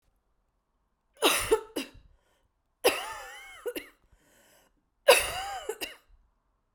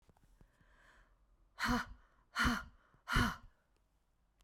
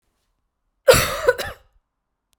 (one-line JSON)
{"three_cough_length": "6.7 s", "three_cough_amplitude": 19770, "three_cough_signal_mean_std_ratio": 0.31, "exhalation_length": "4.4 s", "exhalation_amplitude": 3698, "exhalation_signal_mean_std_ratio": 0.36, "cough_length": "2.4 s", "cough_amplitude": 32767, "cough_signal_mean_std_ratio": 0.3, "survey_phase": "beta (2021-08-13 to 2022-03-07)", "age": "45-64", "gender": "Female", "wearing_mask": "No", "symptom_cough_any": true, "symptom_runny_or_blocked_nose": true, "symptom_fatigue": true, "symptom_headache": true, "symptom_onset": "6 days", "smoker_status": "Never smoked", "respiratory_condition_asthma": false, "respiratory_condition_other": false, "recruitment_source": "Test and Trace", "submission_delay": "2 days", "covid_test_result": "Positive", "covid_test_method": "RT-qPCR", "covid_ct_value": 11.7, "covid_ct_gene": "ORF1ab gene"}